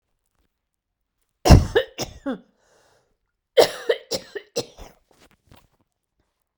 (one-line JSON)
{"cough_length": "6.6 s", "cough_amplitude": 32768, "cough_signal_mean_std_ratio": 0.23, "survey_phase": "beta (2021-08-13 to 2022-03-07)", "age": "45-64", "gender": "Female", "wearing_mask": "No", "symptom_cough_any": true, "symptom_runny_or_blocked_nose": true, "symptom_shortness_of_breath": true, "symptom_sore_throat": true, "symptom_diarrhoea": true, "symptom_fatigue": true, "symptom_headache": true, "smoker_status": "Ex-smoker", "respiratory_condition_asthma": false, "respiratory_condition_other": false, "recruitment_source": "Test and Trace", "submission_delay": "0 days", "covid_test_result": "Positive", "covid_test_method": "LFT"}